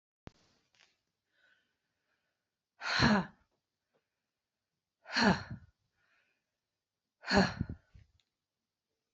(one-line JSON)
{"exhalation_length": "9.1 s", "exhalation_amplitude": 8530, "exhalation_signal_mean_std_ratio": 0.26, "survey_phase": "beta (2021-08-13 to 2022-03-07)", "age": "45-64", "gender": "Female", "wearing_mask": "No", "symptom_none": true, "symptom_onset": "7 days", "smoker_status": "Never smoked", "respiratory_condition_asthma": true, "respiratory_condition_other": false, "recruitment_source": "REACT", "submission_delay": "4 days", "covid_test_result": "Negative", "covid_test_method": "RT-qPCR", "influenza_a_test_result": "Negative", "influenza_b_test_result": "Negative"}